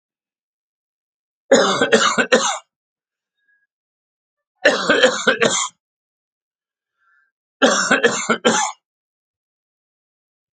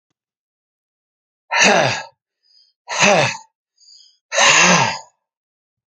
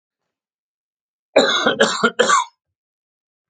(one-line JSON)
{"three_cough_length": "10.6 s", "three_cough_amplitude": 32768, "three_cough_signal_mean_std_ratio": 0.39, "exhalation_length": "5.9 s", "exhalation_amplitude": 32768, "exhalation_signal_mean_std_ratio": 0.41, "cough_length": "3.5 s", "cough_amplitude": 31756, "cough_signal_mean_std_ratio": 0.4, "survey_phase": "beta (2021-08-13 to 2022-03-07)", "age": "45-64", "gender": "Male", "wearing_mask": "No", "symptom_runny_or_blocked_nose": true, "smoker_status": "Never smoked", "respiratory_condition_asthma": false, "respiratory_condition_other": false, "recruitment_source": "Test and Trace", "submission_delay": "1 day", "covid_test_result": "Positive", "covid_test_method": "RT-qPCR", "covid_ct_value": 25.1, "covid_ct_gene": "ORF1ab gene", "covid_ct_mean": 26.0, "covid_viral_load": "2900 copies/ml", "covid_viral_load_category": "Minimal viral load (< 10K copies/ml)"}